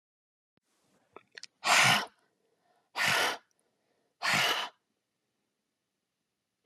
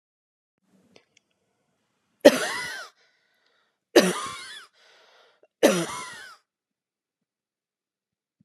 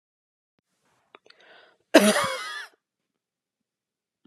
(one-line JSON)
{"exhalation_length": "6.7 s", "exhalation_amplitude": 8948, "exhalation_signal_mean_std_ratio": 0.34, "three_cough_length": "8.4 s", "three_cough_amplitude": 31811, "three_cough_signal_mean_std_ratio": 0.22, "cough_length": "4.3 s", "cough_amplitude": 27276, "cough_signal_mean_std_ratio": 0.23, "survey_phase": "alpha (2021-03-01 to 2021-08-12)", "age": "18-44", "gender": "Female", "wearing_mask": "No", "symptom_none": true, "smoker_status": "Never smoked", "respiratory_condition_asthma": false, "respiratory_condition_other": false, "recruitment_source": "REACT", "submission_delay": "2 days", "covid_test_result": "Negative", "covid_test_method": "RT-qPCR"}